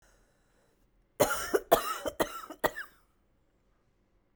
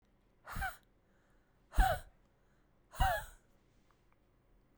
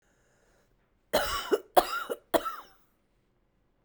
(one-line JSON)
{"cough_length": "4.4 s", "cough_amplitude": 13686, "cough_signal_mean_std_ratio": 0.32, "exhalation_length": "4.8 s", "exhalation_amplitude": 5296, "exhalation_signal_mean_std_ratio": 0.29, "three_cough_length": "3.8 s", "three_cough_amplitude": 20128, "three_cough_signal_mean_std_ratio": 0.32, "survey_phase": "beta (2021-08-13 to 2022-03-07)", "age": "45-64", "gender": "Female", "wearing_mask": "No", "symptom_runny_or_blocked_nose": true, "symptom_abdominal_pain": true, "symptom_diarrhoea": true, "symptom_fatigue": true, "symptom_fever_high_temperature": true, "symptom_headache": true, "symptom_change_to_sense_of_smell_or_taste": true, "symptom_loss_of_taste": true, "symptom_onset": "4 days", "smoker_status": "Ex-smoker", "respiratory_condition_asthma": true, "respiratory_condition_other": false, "recruitment_source": "Test and Trace", "submission_delay": "2 days", "covid_test_result": "Positive", "covid_test_method": "RT-qPCR", "covid_ct_value": 19.0, "covid_ct_gene": "ORF1ab gene", "covid_ct_mean": 19.6, "covid_viral_load": "360000 copies/ml", "covid_viral_load_category": "Low viral load (10K-1M copies/ml)"}